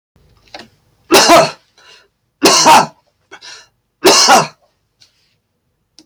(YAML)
three_cough_length: 6.1 s
three_cough_amplitude: 32768
three_cough_signal_mean_std_ratio: 0.41
survey_phase: alpha (2021-03-01 to 2021-08-12)
age: 65+
gender: Male
wearing_mask: 'No'
symptom_none: true
smoker_status: Ex-smoker
respiratory_condition_asthma: false
respiratory_condition_other: false
recruitment_source: REACT
submission_delay: 4 days
covid_test_result: Negative
covid_test_method: RT-qPCR